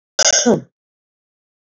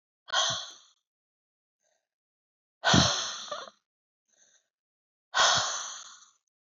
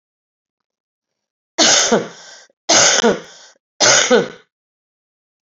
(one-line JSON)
{"cough_length": "1.8 s", "cough_amplitude": 30354, "cough_signal_mean_std_ratio": 0.36, "exhalation_length": "6.7 s", "exhalation_amplitude": 14268, "exhalation_signal_mean_std_ratio": 0.35, "three_cough_length": "5.5 s", "three_cough_amplitude": 32509, "three_cough_signal_mean_std_ratio": 0.41, "survey_phase": "beta (2021-08-13 to 2022-03-07)", "age": "45-64", "gender": "Female", "wearing_mask": "No", "symptom_cough_any": true, "symptom_runny_or_blocked_nose": true, "smoker_status": "Ex-smoker", "respiratory_condition_asthma": false, "respiratory_condition_other": false, "recruitment_source": "Test and Trace", "submission_delay": "2 days", "covid_test_result": "Positive", "covid_test_method": "RT-qPCR", "covid_ct_value": 28.7, "covid_ct_gene": "ORF1ab gene"}